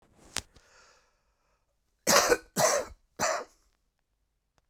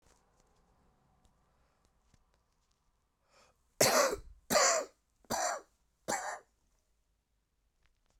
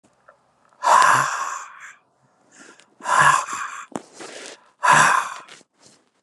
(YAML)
cough_length: 4.7 s
cough_amplitude: 17063
cough_signal_mean_std_ratio: 0.33
three_cough_length: 8.2 s
three_cough_amplitude: 7553
three_cough_signal_mean_std_ratio: 0.3
exhalation_length: 6.2 s
exhalation_amplitude: 29884
exhalation_signal_mean_std_ratio: 0.43
survey_phase: beta (2021-08-13 to 2022-03-07)
age: 65+
gender: Male
wearing_mask: 'No'
symptom_cough_any: true
symptom_runny_or_blocked_nose: true
symptom_sore_throat: true
symptom_fatigue: true
symptom_headache: true
symptom_onset: 2 days
smoker_status: Ex-smoker
respiratory_condition_asthma: true
respiratory_condition_other: false
recruitment_source: Test and Trace
submission_delay: 2 days
covid_test_result: Positive
covid_test_method: RT-qPCR
covid_ct_value: 11.6
covid_ct_gene: ORF1ab gene
covid_ct_mean: 12.2
covid_viral_load: 100000000 copies/ml
covid_viral_load_category: High viral load (>1M copies/ml)